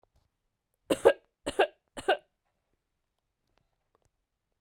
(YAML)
three_cough_length: 4.6 s
three_cough_amplitude: 17254
three_cough_signal_mean_std_ratio: 0.2
survey_phase: beta (2021-08-13 to 2022-03-07)
age: 45-64
gender: Female
wearing_mask: 'No'
symptom_cough_any: true
symptom_fatigue: true
symptom_headache: true
symptom_other: true
symptom_onset: 5 days
smoker_status: Never smoked
respiratory_condition_asthma: false
respiratory_condition_other: false
recruitment_source: Test and Trace
submission_delay: 2 days
covid_test_result: Positive
covid_test_method: RT-qPCR
covid_ct_value: 14.2
covid_ct_gene: N gene